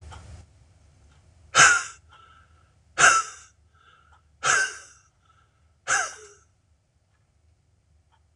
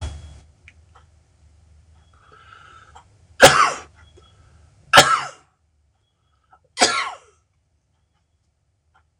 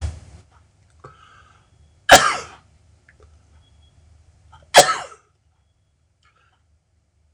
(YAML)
exhalation_length: 8.4 s
exhalation_amplitude: 25640
exhalation_signal_mean_std_ratio: 0.28
three_cough_length: 9.2 s
three_cough_amplitude: 26028
three_cough_signal_mean_std_ratio: 0.24
cough_length: 7.3 s
cough_amplitude: 26028
cough_signal_mean_std_ratio: 0.2
survey_phase: beta (2021-08-13 to 2022-03-07)
age: 65+
gender: Male
wearing_mask: 'No'
symptom_none: true
smoker_status: Ex-smoker
respiratory_condition_asthma: false
respiratory_condition_other: false
recruitment_source: REACT
submission_delay: 0 days
covid_test_result: Negative
covid_test_method: RT-qPCR
influenza_a_test_result: Negative
influenza_b_test_result: Negative